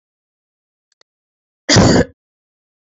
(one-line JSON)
{"cough_length": "2.9 s", "cough_amplitude": 30596, "cough_signal_mean_std_ratio": 0.29, "survey_phase": "beta (2021-08-13 to 2022-03-07)", "age": "18-44", "gender": "Female", "wearing_mask": "No", "symptom_runny_or_blocked_nose": true, "symptom_shortness_of_breath": true, "symptom_fatigue": true, "symptom_headache": true, "symptom_other": true, "symptom_onset": "4 days", "smoker_status": "Never smoked", "respiratory_condition_asthma": false, "respiratory_condition_other": false, "recruitment_source": "Test and Trace", "submission_delay": "2 days", "covid_test_result": "Positive", "covid_test_method": "RT-qPCR", "covid_ct_value": 22.8, "covid_ct_gene": "ORF1ab gene"}